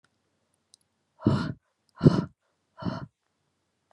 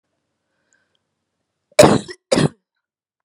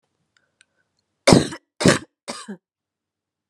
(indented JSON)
{
  "exhalation_length": "3.9 s",
  "exhalation_amplitude": 22375,
  "exhalation_signal_mean_std_ratio": 0.25,
  "cough_length": "3.2 s",
  "cough_amplitude": 32768,
  "cough_signal_mean_std_ratio": 0.25,
  "three_cough_length": "3.5 s",
  "three_cough_amplitude": 32768,
  "three_cough_signal_mean_std_ratio": 0.24,
  "survey_phase": "beta (2021-08-13 to 2022-03-07)",
  "age": "18-44",
  "gender": "Female",
  "wearing_mask": "No",
  "symptom_none": true,
  "symptom_onset": "8 days",
  "smoker_status": "Ex-smoker",
  "respiratory_condition_asthma": false,
  "respiratory_condition_other": false,
  "recruitment_source": "REACT",
  "submission_delay": "1 day",
  "covid_test_result": "Negative",
  "covid_test_method": "RT-qPCR",
  "influenza_a_test_result": "Negative",
  "influenza_b_test_result": "Negative"
}